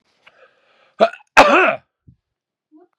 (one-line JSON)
{"cough_length": "3.0 s", "cough_amplitude": 32768, "cough_signal_mean_std_ratio": 0.3, "survey_phase": "beta (2021-08-13 to 2022-03-07)", "age": "45-64", "gender": "Male", "wearing_mask": "No", "symptom_none": true, "smoker_status": "Never smoked", "respiratory_condition_asthma": false, "respiratory_condition_other": false, "recruitment_source": "REACT", "submission_delay": "2 days", "covid_test_result": "Negative", "covid_test_method": "RT-qPCR", "influenza_a_test_result": "Negative", "influenza_b_test_result": "Negative"}